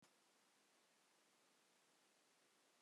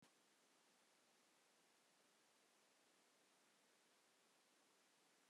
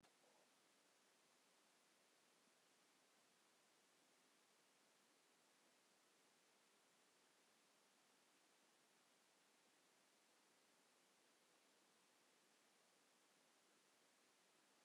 {
  "cough_length": "2.8 s",
  "cough_amplitude": 33,
  "cough_signal_mean_std_ratio": 1.1,
  "exhalation_length": "5.3 s",
  "exhalation_amplitude": 29,
  "exhalation_signal_mean_std_ratio": 1.11,
  "three_cough_length": "14.8 s",
  "three_cough_amplitude": 27,
  "three_cough_signal_mean_std_ratio": 1.13,
  "survey_phase": "beta (2021-08-13 to 2022-03-07)",
  "age": "65+",
  "gender": "Female",
  "wearing_mask": "No",
  "symptom_runny_or_blocked_nose": true,
  "smoker_status": "Never smoked",
  "respiratory_condition_asthma": true,
  "respiratory_condition_other": false,
  "recruitment_source": "Test and Trace",
  "submission_delay": "1 day",
  "covid_test_result": "Positive",
  "covid_test_method": "RT-qPCR",
  "covid_ct_value": 28.2,
  "covid_ct_gene": "ORF1ab gene"
}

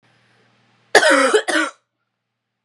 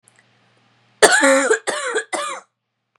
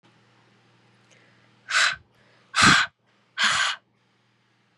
{
  "cough_length": "2.6 s",
  "cough_amplitude": 32768,
  "cough_signal_mean_std_ratio": 0.4,
  "three_cough_length": "3.0 s",
  "three_cough_amplitude": 32768,
  "three_cough_signal_mean_std_ratio": 0.46,
  "exhalation_length": "4.8 s",
  "exhalation_amplitude": 21300,
  "exhalation_signal_mean_std_ratio": 0.34,
  "survey_phase": "beta (2021-08-13 to 2022-03-07)",
  "age": "18-44",
  "gender": "Female",
  "wearing_mask": "No",
  "symptom_runny_or_blocked_nose": true,
  "symptom_onset": "12 days",
  "smoker_status": "Current smoker (e-cigarettes or vapes only)",
  "respiratory_condition_asthma": false,
  "respiratory_condition_other": false,
  "recruitment_source": "REACT",
  "submission_delay": "1 day",
  "covid_test_result": "Negative",
  "covid_test_method": "RT-qPCR",
  "influenza_a_test_result": "Negative",
  "influenza_b_test_result": "Negative"
}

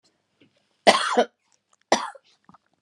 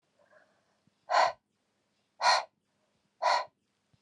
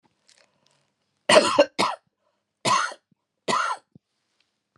{
  "cough_length": "2.8 s",
  "cough_amplitude": 32767,
  "cough_signal_mean_std_ratio": 0.28,
  "exhalation_length": "4.0 s",
  "exhalation_amplitude": 7672,
  "exhalation_signal_mean_std_ratio": 0.32,
  "three_cough_length": "4.8 s",
  "three_cough_amplitude": 23591,
  "three_cough_signal_mean_std_ratio": 0.33,
  "survey_phase": "beta (2021-08-13 to 2022-03-07)",
  "age": "45-64",
  "gender": "Female",
  "wearing_mask": "No",
  "symptom_cough_any": true,
  "symptom_runny_or_blocked_nose": true,
  "symptom_sore_throat": true,
  "symptom_headache": true,
  "symptom_onset": "2 days",
  "smoker_status": "Never smoked",
  "respiratory_condition_asthma": false,
  "respiratory_condition_other": false,
  "recruitment_source": "Test and Trace",
  "submission_delay": "1 day",
  "covid_test_result": "Positive",
  "covid_test_method": "RT-qPCR",
  "covid_ct_value": 25.6,
  "covid_ct_gene": "ORF1ab gene",
  "covid_ct_mean": 26.3,
  "covid_viral_load": "2400 copies/ml",
  "covid_viral_load_category": "Minimal viral load (< 10K copies/ml)"
}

